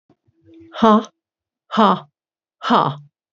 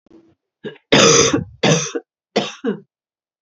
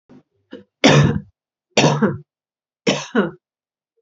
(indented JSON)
{
  "exhalation_length": "3.3 s",
  "exhalation_amplitude": 32767,
  "exhalation_signal_mean_std_ratio": 0.36,
  "cough_length": "3.4 s",
  "cough_amplitude": 32768,
  "cough_signal_mean_std_ratio": 0.44,
  "three_cough_length": "4.0 s",
  "three_cough_amplitude": 32767,
  "three_cough_signal_mean_std_ratio": 0.39,
  "survey_phase": "alpha (2021-03-01 to 2021-08-12)",
  "age": "45-64",
  "gender": "Female",
  "wearing_mask": "No",
  "symptom_cough_any": true,
  "smoker_status": "Never smoked",
  "respiratory_condition_asthma": false,
  "respiratory_condition_other": false,
  "recruitment_source": "Test and Trace",
  "submission_delay": "1 day",
  "covid_test_result": "Positive",
  "covid_test_method": "RT-qPCR",
  "covid_ct_value": 27.2,
  "covid_ct_gene": "ORF1ab gene",
  "covid_ct_mean": 27.9,
  "covid_viral_load": "730 copies/ml",
  "covid_viral_load_category": "Minimal viral load (< 10K copies/ml)"
}